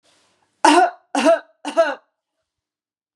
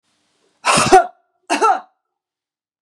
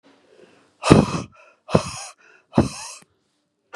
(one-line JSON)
{"three_cough_length": "3.2 s", "three_cough_amplitude": 32749, "three_cough_signal_mean_std_ratio": 0.38, "cough_length": "2.8 s", "cough_amplitude": 32767, "cough_signal_mean_std_ratio": 0.37, "exhalation_length": "3.8 s", "exhalation_amplitude": 32768, "exhalation_signal_mean_std_ratio": 0.29, "survey_phase": "beta (2021-08-13 to 2022-03-07)", "age": "45-64", "gender": "Female", "wearing_mask": "No", "symptom_none": true, "smoker_status": "Never smoked", "respiratory_condition_asthma": false, "respiratory_condition_other": false, "recruitment_source": "REACT", "submission_delay": "2 days", "covid_test_result": "Negative", "covid_test_method": "RT-qPCR", "influenza_a_test_result": "Negative", "influenza_b_test_result": "Negative"}